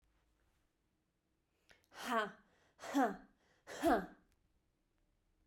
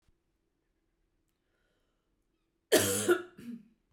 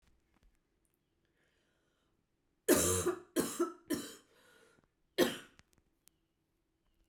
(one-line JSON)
{"exhalation_length": "5.5 s", "exhalation_amplitude": 3124, "exhalation_signal_mean_std_ratio": 0.31, "cough_length": "3.9 s", "cough_amplitude": 12304, "cough_signal_mean_std_ratio": 0.28, "three_cough_length": "7.1 s", "three_cough_amplitude": 6475, "three_cough_signal_mean_std_ratio": 0.3, "survey_phase": "beta (2021-08-13 to 2022-03-07)", "age": "18-44", "gender": "Female", "wearing_mask": "No", "symptom_cough_any": true, "symptom_runny_or_blocked_nose": true, "symptom_shortness_of_breath": true, "symptom_fatigue": true, "symptom_headache": true, "symptom_onset": "4 days", "smoker_status": "Never smoked", "respiratory_condition_asthma": false, "respiratory_condition_other": false, "recruitment_source": "Test and Trace", "submission_delay": "2 days", "covid_test_result": "Positive", "covid_test_method": "RT-qPCR", "covid_ct_value": 15.5, "covid_ct_gene": "N gene", "covid_ct_mean": 15.5, "covid_viral_load": "8100000 copies/ml", "covid_viral_load_category": "High viral load (>1M copies/ml)"}